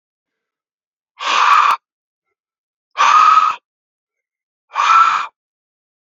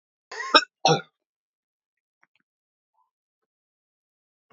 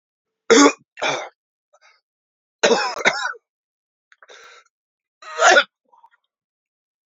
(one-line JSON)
{"exhalation_length": "6.1 s", "exhalation_amplitude": 30013, "exhalation_signal_mean_std_ratio": 0.43, "cough_length": "4.5 s", "cough_amplitude": 29043, "cough_signal_mean_std_ratio": 0.18, "three_cough_length": "7.1 s", "three_cough_amplitude": 30775, "three_cough_signal_mean_std_ratio": 0.31, "survey_phase": "beta (2021-08-13 to 2022-03-07)", "age": "45-64", "gender": "Male", "wearing_mask": "No", "symptom_cough_any": true, "symptom_runny_or_blocked_nose": true, "symptom_shortness_of_breath": true, "symptom_sore_throat": true, "symptom_fatigue": true, "symptom_headache": true, "symptom_change_to_sense_of_smell_or_taste": true, "symptom_onset": "3 days", "smoker_status": "Ex-smoker", "respiratory_condition_asthma": false, "respiratory_condition_other": false, "recruitment_source": "Test and Trace", "submission_delay": "2 days", "covid_test_result": "Positive", "covid_test_method": "RT-qPCR"}